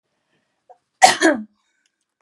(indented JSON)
{
  "cough_length": "2.2 s",
  "cough_amplitude": 32768,
  "cough_signal_mean_std_ratio": 0.27,
  "survey_phase": "beta (2021-08-13 to 2022-03-07)",
  "age": "18-44",
  "gender": "Female",
  "wearing_mask": "No",
  "symptom_none": true,
  "smoker_status": "Never smoked",
  "respiratory_condition_asthma": false,
  "respiratory_condition_other": false,
  "recruitment_source": "REACT",
  "submission_delay": "1 day",
  "covid_test_result": "Negative",
  "covid_test_method": "RT-qPCR",
  "influenza_a_test_result": "Negative",
  "influenza_b_test_result": "Negative"
}